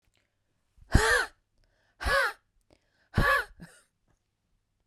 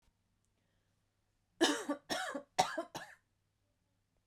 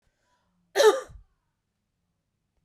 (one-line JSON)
{"exhalation_length": "4.9 s", "exhalation_amplitude": 19408, "exhalation_signal_mean_std_ratio": 0.34, "three_cough_length": "4.3 s", "three_cough_amplitude": 6178, "three_cough_signal_mean_std_ratio": 0.32, "cough_length": "2.6 s", "cough_amplitude": 14601, "cough_signal_mean_std_ratio": 0.23, "survey_phase": "beta (2021-08-13 to 2022-03-07)", "age": "45-64", "gender": "Female", "wearing_mask": "No", "symptom_cough_any": true, "symptom_new_continuous_cough": true, "symptom_runny_or_blocked_nose": true, "symptom_sore_throat": true, "symptom_fatigue": true, "symptom_headache": true, "symptom_onset": "5 days", "smoker_status": "Ex-smoker", "respiratory_condition_asthma": false, "respiratory_condition_other": false, "recruitment_source": "REACT", "submission_delay": "2 days", "covid_test_result": "Positive", "covid_test_method": "RT-qPCR", "covid_ct_value": 26.0, "covid_ct_gene": "E gene", "influenza_a_test_result": "Unknown/Void", "influenza_b_test_result": "Unknown/Void"}